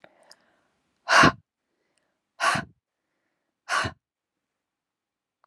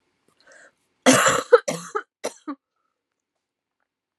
{
  "exhalation_length": "5.5 s",
  "exhalation_amplitude": 23246,
  "exhalation_signal_mean_std_ratio": 0.24,
  "cough_length": "4.2 s",
  "cough_amplitude": 27900,
  "cough_signal_mean_std_ratio": 0.28,
  "survey_phase": "alpha (2021-03-01 to 2021-08-12)",
  "age": "45-64",
  "gender": "Female",
  "wearing_mask": "No",
  "symptom_cough_any": true,
  "symptom_fatigue": true,
  "symptom_headache": true,
  "symptom_onset": "4 days",
  "smoker_status": "Never smoked",
  "respiratory_condition_asthma": false,
  "respiratory_condition_other": false,
  "recruitment_source": "Test and Trace",
  "submission_delay": "2 days",
  "covid_test_result": "Positive",
  "covid_test_method": "RT-qPCR",
  "covid_ct_value": 18.1,
  "covid_ct_gene": "ORF1ab gene",
  "covid_ct_mean": 18.4,
  "covid_viral_load": "900000 copies/ml",
  "covid_viral_load_category": "Low viral load (10K-1M copies/ml)"
}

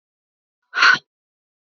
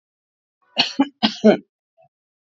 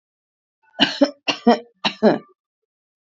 {
  "exhalation_length": "1.7 s",
  "exhalation_amplitude": 26589,
  "exhalation_signal_mean_std_ratio": 0.27,
  "cough_length": "2.5 s",
  "cough_amplitude": 25737,
  "cough_signal_mean_std_ratio": 0.3,
  "three_cough_length": "3.1 s",
  "three_cough_amplitude": 32044,
  "three_cough_signal_mean_std_ratio": 0.33,
  "survey_phase": "alpha (2021-03-01 to 2021-08-12)",
  "age": "18-44",
  "gender": "Female",
  "wearing_mask": "No",
  "symptom_none": true,
  "symptom_onset": "4 days",
  "smoker_status": "Ex-smoker",
  "respiratory_condition_asthma": false,
  "respiratory_condition_other": false,
  "recruitment_source": "REACT",
  "submission_delay": "1 day",
  "covid_test_result": "Negative",
  "covid_test_method": "RT-qPCR"
}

